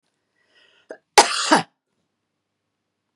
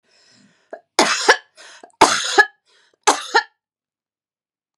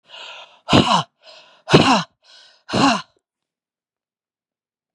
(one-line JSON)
{"cough_length": "3.2 s", "cough_amplitude": 32768, "cough_signal_mean_std_ratio": 0.23, "three_cough_length": "4.8 s", "three_cough_amplitude": 32768, "three_cough_signal_mean_std_ratio": 0.32, "exhalation_length": "4.9 s", "exhalation_amplitude": 32768, "exhalation_signal_mean_std_ratio": 0.34, "survey_phase": "beta (2021-08-13 to 2022-03-07)", "age": "45-64", "gender": "Female", "wearing_mask": "No", "symptom_none": true, "smoker_status": "Ex-smoker", "respiratory_condition_asthma": false, "respiratory_condition_other": false, "recruitment_source": "REACT", "submission_delay": "1 day", "covid_test_result": "Negative", "covid_test_method": "RT-qPCR", "influenza_a_test_result": "Negative", "influenza_b_test_result": "Negative"}